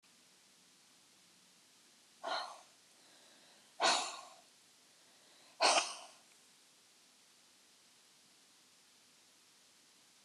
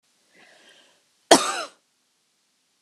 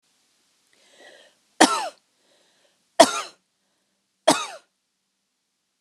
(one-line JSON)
{"exhalation_length": "10.2 s", "exhalation_amplitude": 4565, "exhalation_signal_mean_std_ratio": 0.27, "cough_length": "2.8 s", "cough_amplitude": 32694, "cough_signal_mean_std_ratio": 0.2, "three_cough_length": "5.8 s", "three_cough_amplitude": 32768, "three_cough_signal_mean_std_ratio": 0.21, "survey_phase": "beta (2021-08-13 to 2022-03-07)", "age": "45-64", "gender": "Female", "wearing_mask": "No", "symptom_none": true, "smoker_status": "Ex-smoker", "respiratory_condition_asthma": false, "respiratory_condition_other": false, "recruitment_source": "REACT", "submission_delay": "1 day", "covid_test_result": "Negative", "covid_test_method": "RT-qPCR"}